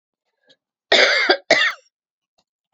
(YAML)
cough_length: 2.7 s
cough_amplitude: 30472
cough_signal_mean_std_ratio: 0.39
survey_phase: alpha (2021-03-01 to 2021-08-12)
age: 18-44
gender: Female
wearing_mask: 'No'
symptom_cough_any: true
symptom_headache: true
symptom_change_to_sense_of_smell_or_taste: true
symptom_onset: 4 days
smoker_status: Ex-smoker
respiratory_condition_asthma: false
respiratory_condition_other: false
recruitment_source: Test and Trace
submission_delay: 2 days
covid_test_result: Positive
covid_test_method: RT-qPCR
covid_ct_value: 17.6
covid_ct_gene: ORF1ab gene